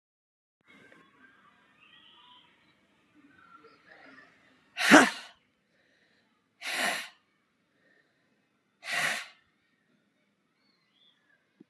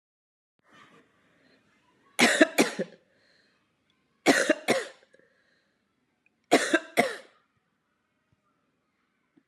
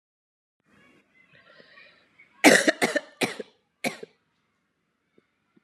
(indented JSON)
{
  "exhalation_length": "11.7 s",
  "exhalation_amplitude": 29407,
  "exhalation_signal_mean_std_ratio": 0.19,
  "three_cough_length": "9.5 s",
  "three_cough_amplitude": 23031,
  "three_cough_signal_mean_std_ratio": 0.27,
  "cough_length": "5.6 s",
  "cough_amplitude": 31233,
  "cough_signal_mean_std_ratio": 0.23,
  "survey_phase": "beta (2021-08-13 to 2022-03-07)",
  "age": "45-64",
  "gender": "Female",
  "wearing_mask": "No",
  "symptom_cough_any": true,
  "symptom_runny_or_blocked_nose": true,
  "symptom_fatigue": true,
  "symptom_fever_high_temperature": true,
  "symptom_headache": true,
  "symptom_change_to_sense_of_smell_or_taste": true,
  "symptom_onset": "2 days",
  "smoker_status": "Never smoked",
  "respiratory_condition_asthma": false,
  "respiratory_condition_other": false,
  "recruitment_source": "Test and Trace",
  "submission_delay": "1 day",
  "covid_test_result": "Negative",
  "covid_test_method": "RT-qPCR"
}